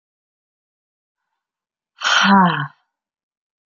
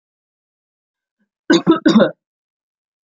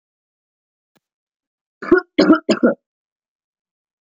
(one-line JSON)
{"exhalation_length": "3.7 s", "exhalation_amplitude": 27359, "exhalation_signal_mean_std_ratio": 0.32, "cough_length": "3.2 s", "cough_amplitude": 32768, "cough_signal_mean_std_ratio": 0.3, "three_cough_length": "4.0 s", "three_cough_amplitude": 32768, "three_cough_signal_mean_std_ratio": 0.27, "survey_phase": "beta (2021-08-13 to 2022-03-07)", "age": "18-44", "gender": "Female", "wearing_mask": "No", "symptom_none": true, "smoker_status": "Never smoked", "respiratory_condition_asthma": false, "respiratory_condition_other": false, "recruitment_source": "Test and Trace", "submission_delay": "1 day", "covid_test_result": "Negative", "covid_test_method": "RT-qPCR"}